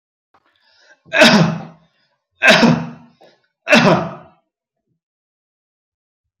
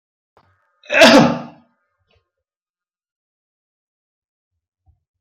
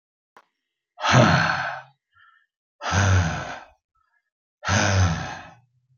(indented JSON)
{
  "three_cough_length": "6.4 s",
  "three_cough_amplitude": 31588,
  "three_cough_signal_mean_std_ratio": 0.36,
  "cough_length": "5.2 s",
  "cough_amplitude": 31783,
  "cough_signal_mean_std_ratio": 0.23,
  "exhalation_length": "6.0 s",
  "exhalation_amplitude": 25373,
  "exhalation_signal_mean_std_ratio": 0.48,
  "survey_phase": "beta (2021-08-13 to 2022-03-07)",
  "age": "45-64",
  "gender": "Male",
  "wearing_mask": "No",
  "symptom_runny_or_blocked_nose": true,
  "smoker_status": "Never smoked",
  "respiratory_condition_asthma": false,
  "respiratory_condition_other": false,
  "recruitment_source": "REACT",
  "submission_delay": "1 day",
  "covid_test_result": "Negative",
  "covid_test_method": "RT-qPCR",
  "influenza_a_test_result": "Negative",
  "influenza_b_test_result": "Negative"
}